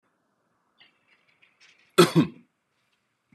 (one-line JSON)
{"cough_length": "3.3 s", "cough_amplitude": 24522, "cough_signal_mean_std_ratio": 0.2, "survey_phase": "beta (2021-08-13 to 2022-03-07)", "age": "18-44", "gender": "Male", "wearing_mask": "No", "symptom_none": true, "smoker_status": "Ex-smoker", "respiratory_condition_asthma": false, "respiratory_condition_other": false, "recruitment_source": "REACT", "submission_delay": "0 days", "covid_test_result": "Negative", "covid_test_method": "RT-qPCR", "influenza_a_test_result": "Negative", "influenza_b_test_result": "Negative"}